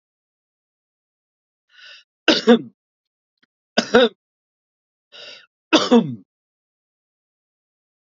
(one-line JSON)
{"three_cough_length": "8.0 s", "three_cough_amplitude": 32767, "three_cough_signal_mean_std_ratio": 0.24, "survey_phase": "beta (2021-08-13 to 2022-03-07)", "age": "18-44", "gender": "Male", "wearing_mask": "No", "symptom_none": true, "smoker_status": "Never smoked", "respiratory_condition_asthma": false, "respiratory_condition_other": false, "recruitment_source": "Test and Trace", "submission_delay": "0 days", "covid_test_result": "Negative", "covid_test_method": "LFT"}